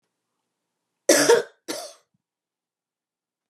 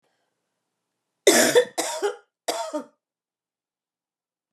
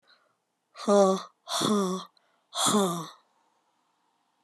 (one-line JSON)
{"cough_length": "3.5 s", "cough_amplitude": 26814, "cough_signal_mean_std_ratio": 0.26, "three_cough_length": "4.5 s", "three_cough_amplitude": 24839, "three_cough_signal_mean_std_ratio": 0.32, "exhalation_length": "4.4 s", "exhalation_amplitude": 11425, "exhalation_signal_mean_std_ratio": 0.43, "survey_phase": "beta (2021-08-13 to 2022-03-07)", "age": "45-64", "gender": "Female", "wearing_mask": "No", "symptom_cough_any": true, "symptom_runny_or_blocked_nose": true, "symptom_headache": true, "symptom_change_to_sense_of_smell_or_taste": true, "symptom_other": true, "smoker_status": "Never smoked", "respiratory_condition_asthma": false, "respiratory_condition_other": false, "recruitment_source": "Test and Trace", "submission_delay": "2 days", "covid_test_result": "Positive", "covid_test_method": "RT-qPCR", "covid_ct_value": 30.6, "covid_ct_gene": "ORF1ab gene"}